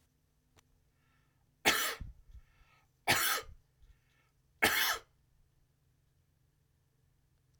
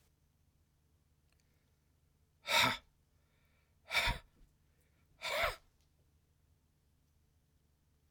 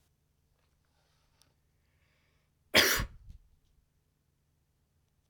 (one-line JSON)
{"three_cough_length": "7.6 s", "three_cough_amplitude": 10454, "three_cough_signal_mean_std_ratio": 0.3, "exhalation_length": "8.1 s", "exhalation_amplitude": 4664, "exhalation_signal_mean_std_ratio": 0.27, "cough_length": "5.3 s", "cough_amplitude": 11420, "cough_signal_mean_std_ratio": 0.19, "survey_phase": "beta (2021-08-13 to 2022-03-07)", "age": "45-64", "gender": "Male", "wearing_mask": "No", "symptom_fatigue": true, "symptom_headache": true, "symptom_onset": "9 days", "smoker_status": "Ex-smoker", "respiratory_condition_asthma": false, "respiratory_condition_other": false, "recruitment_source": "REACT", "submission_delay": "3 days", "covid_test_result": "Negative", "covid_test_method": "RT-qPCR", "influenza_a_test_result": "Negative", "influenza_b_test_result": "Negative"}